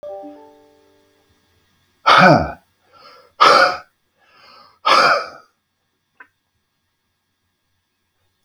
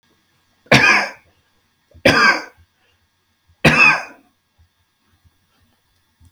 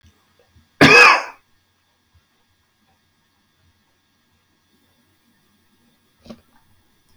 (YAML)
exhalation_length: 8.4 s
exhalation_amplitude: 32768
exhalation_signal_mean_std_ratio: 0.31
three_cough_length: 6.3 s
three_cough_amplitude: 32768
three_cough_signal_mean_std_ratio: 0.33
cough_length: 7.2 s
cough_amplitude: 32768
cough_signal_mean_std_ratio: 0.2
survey_phase: beta (2021-08-13 to 2022-03-07)
age: 65+
gender: Male
wearing_mask: 'No'
symptom_cough_any: true
symptom_runny_or_blocked_nose: true
smoker_status: Never smoked
respiratory_condition_asthma: false
respiratory_condition_other: false
recruitment_source: REACT
submission_delay: 2 days
covid_test_result: Negative
covid_test_method: RT-qPCR
influenza_a_test_result: Negative
influenza_b_test_result: Negative